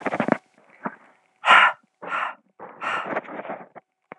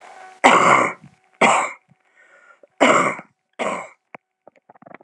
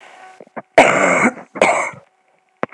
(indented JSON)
{
  "exhalation_length": "4.2 s",
  "exhalation_amplitude": 30022,
  "exhalation_signal_mean_std_ratio": 0.37,
  "three_cough_length": "5.0 s",
  "three_cough_amplitude": 32768,
  "three_cough_signal_mean_std_ratio": 0.4,
  "cough_length": "2.7 s",
  "cough_amplitude": 32768,
  "cough_signal_mean_std_ratio": 0.45,
  "survey_phase": "beta (2021-08-13 to 2022-03-07)",
  "age": "18-44",
  "gender": "Female",
  "wearing_mask": "No",
  "symptom_cough_any": true,
  "symptom_runny_or_blocked_nose": true,
  "symptom_sore_throat": true,
  "symptom_abdominal_pain": true,
  "symptom_diarrhoea": true,
  "symptom_fatigue": true,
  "symptom_fever_high_temperature": true,
  "symptom_change_to_sense_of_smell_or_taste": true,
  "symptom_loss_of_taste": true,
  "symptom_onset": "3 days",
  "smoker_status": "Ex-smoker",
  "respiratory_condition_asthma": false,
  "respiratory_condition_other": false,
  "recruitment_source": "Test and Trace",
  "submission_delay": "2 days",
  "covid_test_result": "Positive",
  "covid_test_method": "RT-qPCR",
  "covid_ct_value": 16.5,
  "covid_ct_gene": "N gene",
  "covid_ct_mean": 16.9,
  "covid_viral_load": "2900000 copies/ml",
  "covid_viral_load_category": "High viral load (>1M copies/ml)"
}